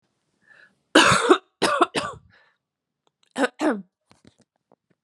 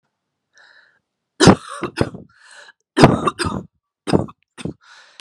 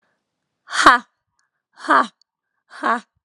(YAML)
cough_length: 5.0 s
cough_amplitude: 32767
cough_signal_mean_std_ratio: 0.34
three_cough_length: 5.2 s
three_cough_amplitude: 32768
three_cough_signal_mean_std_ratio: 0.3
exhalation_length: 3.2 s
exhalation_amplitude: 32768
exhalation_signal_mean_std_ratio: 0.3
survey_phase: alpha (2021-03-01 to 2021-08-12)
age: 18-44
gender: Female
wearing_mask: 'No'
symptom_cough_any: true
symptom_shortness_of_breath: true
symptom_diarrhoea: true
symptom_fatigue: true
symptom_fever_high_temperature: true
symptom_headache: true
symptom_onset: 6 days
smoker_status: Current smoker (e-cigarettes or vapes only)
respiratory_condition_asthma: true
respiratory_condition_other: false
recruitment_source: Test and Trace
submission_delay: 1 day
covid_test_result: Positive
covid_test_method: RT-qPCR
covid_ct_value: 16.2
covid_ct_gene: ORF1ab gene
covid_ct_mean: 16.6
covid_viral_load: 3600000 copies/ml
covid_viral_load_category: High viral load (>1M copies/ml)